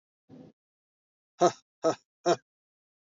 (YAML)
exhalation_length: 3.2 s
exhalation_amplitude: 10961
exhalation_signal_mean_std_ratio: 0.23
survey_phase: beta (2021-08-13 to 2022-03-07)
age: 18-44
gender: Male
wearing_mask: 'No'
symptom_none: true
smoker_status: Current smoker (1 to 10 cigarettes per day)
respiratory_condition_asthma: false
respiratory_condition_other: false
recruitment_source: REACT
submission_delay: 2 days
covid_test_result: Negative
covid_test_method: RT-qPCR
influenza_a_test_result: Unknown/Void
influenza_b_test_result: Unknown/Void